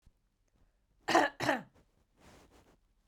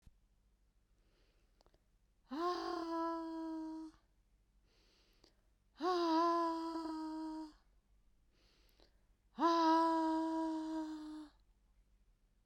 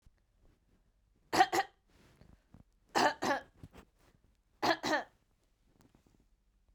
{"cough_length": "3.1 s", "cough_amplitude": 8856, "cough_signal_mean_std_ratio": 0.29, "exhalation_length": "12.5 s", "exhalation_amplitude": 2529, "exhalation_signal_mean_std_ratio": 0.57, "three_cough_length": "6.7 s", "three_cough_amplitude": 7300, "three_cough_signal_mean_std_ratio": 0.3, "survey_phase": "beta (2021-08-13 to 2022-03-07)", "age": "45-64", "gender": "Female", "wearing_mask": "No", "symptom_cough_any": true, "symptom_runny_or_blocked_nose": true, "symptom_shortness_of_breath": true, "symptom_sore_throat": true, "symptom_headache": true, "smoker_status": "Never smoked", "respiratory_condition_asthma": false, "respiratory_condition_other": false, "recruitment_source": "Test and Trace", "submission_delay": "2 days", "covid_test_result": "Positive", "covid_test_method": "RT-qPCR", "covid_ct_value": 21.3, "covid_ct_gene": "ORF1ab gene", "covid_ct_mean": 22.0, "covid_viral_load": "62000 copies/ml", "covid_viral_load_category": "Low viral load (10K-1M copies/ml)"}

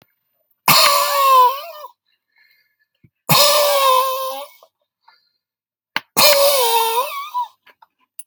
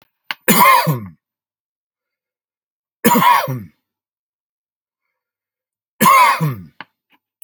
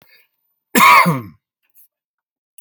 {"exhalation_length": "8.3 s", "exhalation_amplitude": 32768, "exhalation_signal_mean_std_ratio": 0.53, "three_cough_length": "7.4 s", "three_cough_amplitude": 32768, "three_cough_signal_mean_std_ratio": 0.37, "cough_length": "2.6 s", "cough_amplitude": 31583, "cough_signal_mean_std_ratio": 0.34, "survey_phase": "alpha (2021-03-01 to 2021-08-12)", "age": "45-64", "gender": "Male", "wearing_mask": "No", "symptom_none": true, "smoker_status": "Ex-smoker", "respiratory_condition_asthma": false, "respiratory_condition_other": false, "recruitment_source": "REACT", "submission_delay": "3 days", "covid_test_result": "Negative", "covid_test_method": "RT-qPCR"}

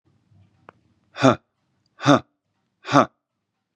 {"exhalation_length": "3.8 s", "exhalation_amplitude": 32748, "exhalation_signal_mean_std_ratio": 0.24, "survey_phase": "beta (2021-08-13 to 2022-03-07)", "age": "18-44", "gender": "Male", "wearing_mask": "No", "symptom_fatigue": true, "symptom_headache": true, "smoker_status": "Ex-smoker", "respiratory_condition_asthma": false, "respiratory_condition_other": false, "recruitment_source": "Test and Trace", "submission_delay": "1 day", "covid_test_result": "Positive", "covid_test_method": "RT-qPCR"}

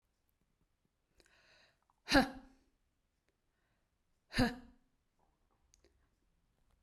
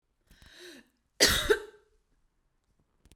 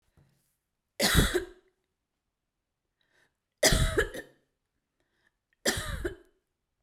{"exhalation_length": "6.8 s", "exhalation_amplitude": 4852, "exhalation_signal_mean_std_ratio": 0.19, "cough_length": "3.2 s", "cough_amplitude": 17084, "cough_signal_mean_std_ratio": 0.28, "three_cough_length": "6.8 s", "three_cough_amplitude": 12921, "three_cough_signal_mean_std_ratio": 0.33, "survey_phase": "beta (2021-08-13 to 2022-03-07)", "age": "45-64", "gender": "Female", "wearing_mask": "No", "symptom_headache": true, "smoker_status": "Never smoked", "respiratory_condition_asthma": false, "respiratory_condition_other": false, "recruitment_source": "REACT", "submission_delay": "3 days", "covid_test_result": "Negative", "covid_test_method": "RT-qPCR"}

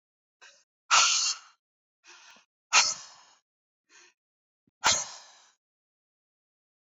{"exhalation_length": "7.0 s", "exhalation_amplitude": 13775, "exhalation_signal_mean_std_ratio": 0.28, "survey_phase": "beta (2021-08-13 to 2022-03-07)", "age": "18-44", "gender": "Female", "wearing_mask": "No", "symptom_runny_or_blocked_nose": true, "smoker_status": "Ex-smoker", "respiratory_condition_asthma": false, "respiratory_condition_other": false, "recruitment_source": "REACT", "submission_delay": "2 days", "covid_test_result": "Negative", "covid_test_method": "RT-qPCR", "influenza_a_test_result": "Negative", "influenza_b_test_result": "Negative"}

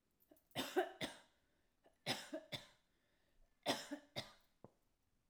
{"three_cough_length": "5.3 s", "three_cough_amplitude": 2001, "three_cough_signal_mean_std_ratio": 0.35, "survey_phase": "alpha (2021-03-01 to 2021-08-12)", "age": "45-64", "gender": "Female", "wearing_mask": "No", "symptom_none": true, "smoker_status": "Ex-smoker", "respiratory_condition_asthma": false, "respiratory_condition_other": false, "recruitment_source": "REACT", "submission_delay": "2 days", "covid_test_result": "Negative", "covid_test_method": "RT-qPCR"}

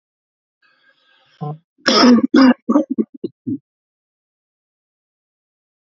{"cough_length": "5.9 s", "cough_amplitude": 32221, "cough_signal_mean_std_ratio": 0.33, "survey_phase": "beta (2021-08-13 to 2022-03-07)", "age": "18-44", "gender": "Male", "wearing_mask": "No", "symptom_none": true, "smoker_status": "Never smoked", "respiratory_condition_asthma": true, "respiratory_condition_other": false, "recruitment_source": "REACT", "submission_delay": "2 days", "covid_test_result": "Negative", "covid_test_method": "RT-qPCR", "influenza_a_test_result": "Negative", "influenza_b_test_result": "Negative"}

